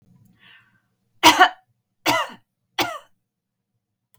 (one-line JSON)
{"three_cough_length": "4.2 s", "three_cough_amplitude": 32768, "three_cough_signal_mean_std_ratio": 0.26, "survey_phase": "beta (2021-08-13 to 2022-03-07)", "age": "65+", "gender": "Female", "wearing_mask": "No", "symptom_none": true, "smoker_status": "Never smoked", "respiratory_condition_asthma": false, "respiratory_condition_other": false, "recruitment_source": "REACT", "submission_delay": "1 day", "covid_test_result": "Negative", "covid_test_method": "RT-qPCR", "influenza_a_test_result": "Negative", "influenza_b_test_result": "Negative"}